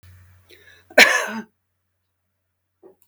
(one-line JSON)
{"cough_length": "3.1 s", "cough_amplitude": 32768, "cough_signal_mean_std_ratio": 0.23, "survey_phase": "beta (2021-08-13 to 2022-03-07)", "age": "65+", "gender": "Female", "wearing_mask": "No", "symptom_none": true, "symptom_onset": "12 days", "smoker_status": "Never smoked", "respiratory_condition_asthma": false, "respiratory_condition_other": false, "recruitment_source": "REACT", "submission_delay": "2 days", "covid_test_result": "Negative", "covid_test_method": "RT-qPCR"}